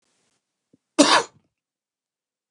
cough_length: 2.5 s
cough_amplitude: 29207
cough_signal_mean_std_ratio: 0.23
survey_phase: alpha (2021-03-01 to 2021-08-12)
age: 45-64
gender: Male
wearing_mask: 'No'
symptom_none: true
smoker_status: Never smoked
respiratory_condition_asthma: false
respiratory_condition_other: false
recruitment_source: REACT
submission_delay: 5 days
covid_test_result: Negative
covid_test_method: RT-qPCR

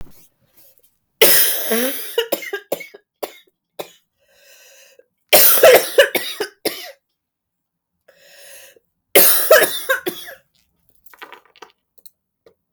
three_cough_length: 12.7 s
three_cough_amplitude: 32768
three_cough_signal_mean_std_ratio: 0.36
survey_phase: beta (2021-08-13 to 2022-03-07)
age: 18-44
gender: Female
wearing_mask: 'No'
symptom_cough_any: true
symptom_new_continuous_cough: true
symptom_runny_or_blocked_nose: true
symptom_shortness_of_breath: true
symptom_onset: 5 days
smoker_status: Never smoked
respiratory_condition_asthma: true
respiratory_condition_other: false
recruitment_source: Test and Trace
submission_delay: 2 days
covid_test_result: Positive
covid_test_method: RT-qPCR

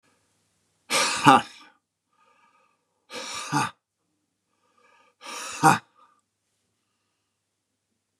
exhalation_length: 8.2 s
exhalation_amplitude: 31641
exhalation_signal_mean_std_ratio: 0.25
survey_phase: beta (2021-08-13 to 2022-03-07)
age: 45-64
gender: Male
wearing_mask: 'No'
symptom_none: true
smoker_status: Ex-smoker
respiratory_condition_asthma: false
respiratory_condition_other: false
recruitment_source: REACT
submission_delay: -1 day
covid_test_result: Negative
covid_test_method: RT-qPCR
influenza_a_test_result: Unknown/Void
influenza_b_test_result: Unknown/Void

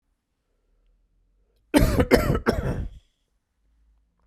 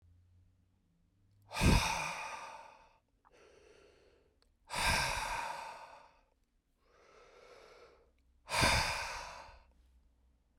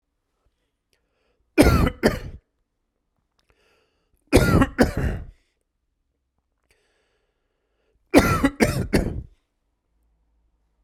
cough_length: 4.3 s
cough_amplitude: 32393
cough_signal_mean_std_ratio: 0.35
exhalation_length: 10.6 s
exhalation_amplitude: 6458
exhalation_signal_mean_std_ratio: 0.39
three_cough_length: 10.8 s
three_cough_amplitude: 32767
three_cough_signal_mean_std_ratio: 0.32
survey_phase: beta (2021-08-13 to 2022-03-07)
age: 45-64
gender: Male
wearing_mask: 'No'
symptom_cough_any: true
symptom_runny_or_blocked_nose: true
symptom_fatigue: true
symptom_change_to_sense_of_smell_or_taste: true
symptom_loss_of_taste: true
smoker_status: Ex-smoker
respiratory_condition_asthma: false
respiratory_condition_other: false
recruitment_source: Test and Trace
submission_delay: 1 day
covid_test_result: Positive
covid_test_method: LAMP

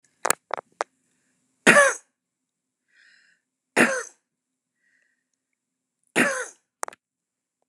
three_cough_length: 7.7 s
three_cough_amplitude: 32768
three_cough_signal_mean_std_ratio: 0.24
survey_phase: alpha (2021-03-01 to 2021-08-12)
age: 65+
gender: Female
wearing_mask: 'No'
symptom_none: true
smoker_status: Ex-smoker
respiratory_condition_asthma: false
respiratory_condition_other: false
recruitment_source: REACT
submission_delay: 3 days
covid_test_result: Negative
covid_test_method: RT-qPCR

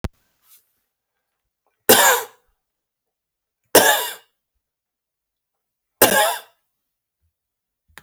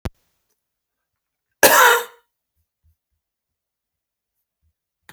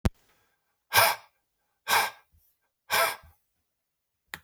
three_cough_length: 8.0 s
three_cough_amplitude: 32768
three_cough_signal_mean_std_ratio: 0.27
cough_length: 5.1 s
cough_amplitude: 32768
cough_signal_mean_std_ratio: 0.22
exhalation_length: 4.4 s
exhalation_amplitude: 17555
exhalation_signal_mean_std_ratio: 0.31
survey_phase: beta (2021-08-13 to 2022-03-07)
age: 45-64
gender: Male
wearing_mask: 'No'
symptom_none: true
smoker_status: Never smoked
respiratory_condition_asthma: false
respiratory_condition_other: false
recruitment_source: REACT
submission_delay: 2 days
covid_test_result: Negative
covid_test_method: RT-qPCR
influenza_a_test_result: Negative
influenza_b_test_result: Negative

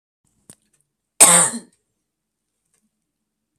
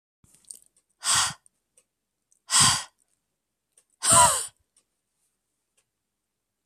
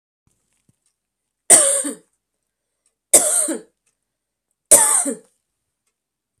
cough_length: 3.6 s
cough_amplitude: 32768
cough_signal_mean_std_ratio: 0.23
exhalation_length: 6.7 s
exhalation_amplitude: 20266
exhalation_signal_mean_std_ratio: 0.29
three_cough_length: 6.4 s
three_cough_amplitude: 32768
three_cough_signal_mean_std_ratio: 0.31
survey_phase: beta (2021-08-13 to 2022-03-07)
age: 45-64
gender: Female
wearing_mask: 'No'
symptom_runny_or_blocked_nose: true
symptom_sore_throat: true
smoker_status: Ex-smoker
respiratory_condition_asthma: false
respiratory_condition_other: false
recruitment_source: Test and Trace
submission_delay: 2 days
covid_test_result: Positive
covid_test_method: RT-qPCR
covid_ct_value: 16.2
covid_ct_gene: N gene
covid_ct_mean: 16.3
covid_viral_load: 4600000 copies/ml
covid_viral_load_category: High viral load (>1M copies/ml)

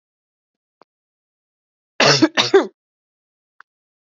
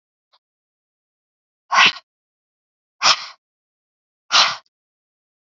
cough_length: 4.0 s
cough_amplitude: 32768
cough_signal_mean_std_ratio: 0.27
exhalation_length: 5.5 s
exhalation_amplitude: 31367
exhalation_signal_mean_std_ratio: 0.25
survey_phase: alpha (2021-03-01 to 2021-08-12)
age: 18-44
gender: Female
wearing_mask: 'No'
symptom_fatigue: true
symptom_onset: 12 days
smoker_status: Ex-smoker
respiratory_condition_asthma: false
respiratory_condition_other: false
recruitment_source: REACT
submission_delay: 2 days
covid_test_result: Negative
covid_test_method: RT-qPCR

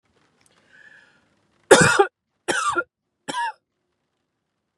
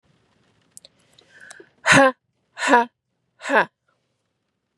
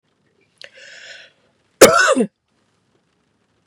three_cough_length: 4.8 s
three_cough_amplitude: 32767
three_cough_signal_mean_std_ratio: 0.29
exhalation_length: 4.8 s
exhalation_amplitude: 32169
exhalation_signal_mean_std_ratio: 0.29
cough_length: 3.7 s
cough_amplitude: 32768
cough_signal_mean_std_ratio: 0.26
survey_phase: beta (2021-08-13 to 2022-03-07)
age: 18-44
gender: Female
wearing_mask: 'No'
symptom_none: true
smoker_status: Never smoked
respiratory_condition_asthma: false
respiratory_condition_other: false
recruitment_source: REACT
submission_delay: 0 days
covid_test_result: Negative
covid_test_method: RT-qPCR
influenza_a_test_result: Negative
influenza_b_test_result: Negative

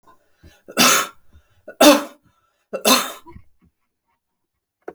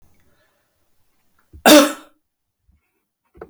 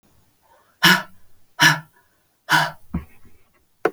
three_cough_length: 4.9 s
three_cough_amplitude: 32157
three_cough_signal_mean_std_ratio: 0.31
cough_length: 3.5 s
cough_amplitude: 32658
cough_signal_mean_std_ratio: 0.22
exhalation_length: 3.9 s
exhalation_amplitude: 31087
exhalation_signal_mean_std_ratio: 0.33
survey_phase: beta (2021-08-13 to 2022-03-07)
age: 65+
gender: Female
wearing_mask: 'No'
symptom_sore_throat: true
symptom_onset: 12 days
smoker_status: Ex-smoker
respiratory_condition_asthma: true
respiratory_condition_other: false
recruitment_source: REACT
submission_delay: 2 days
covid_test_result: Negative
covid_test_method: RT-qPCR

